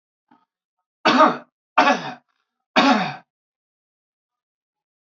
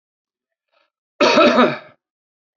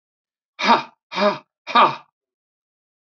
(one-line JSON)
{"three_cough_length": "5.0 s", "three_cough_amplitude": 27391, "three_cough_signal_mean_std_ratio": 0.33, "cough_length": "2.6 s", "cough_amplitude": 29464, "cough_signal_mean_std_ratio": 0.38, "exhalation_length": "3.1 s", "exhalation_amplitude": 27924, "exhalation_signal_mean_std_ratio": 0.34, "survey_phase": "beta (2021-08-13 to 2022-03-07)", "age": "45-64", "gender": "Male", "wearing_mask": "No", "symptom_none": true, "symptom_onset": "12 days", "smoker_status": "Ex-smoker", "respiratory_condition_asthma": false, "respiratory_condition_other": false, "recruitment_source": "REACT", "submission_delay": "2 days", "covid_test_result": "Negative", "covid_test_method": "RT-qPCR"}